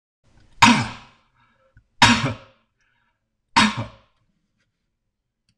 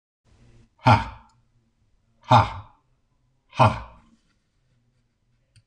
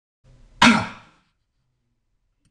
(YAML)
three_cough_length: 5.6 s
three_cough_amplitude: 26028
three_cough_signal_mean_std_ratio: 0.28
exhalation_length: 5.7 s
exhalation_amplitude: 24158
exhalation_signal_mean_std_ratio: 0.24
cough_length: 2.5 s
cough_amplitude: 26028
cough_signal_mean_std_ratio: 0.24
survey_phase: beta (2021-08-13 to 2022-03-07)
age: 65+
gender: Male
wearing_mask: 'No'
symptom_none: true
smoker_status: Never smoked
respiratory_condition_asthma: false
respiratory_condition_other: false
recruitment_source: REACT
submission_delay: 4 days
covid_test_result: Negative
covid_test_method: RT-qPCR
covid_ct_value: 37.8
covid_ct_gene: E gene
influenza_a_test_result: Negative
influenza_b_test_result: Negative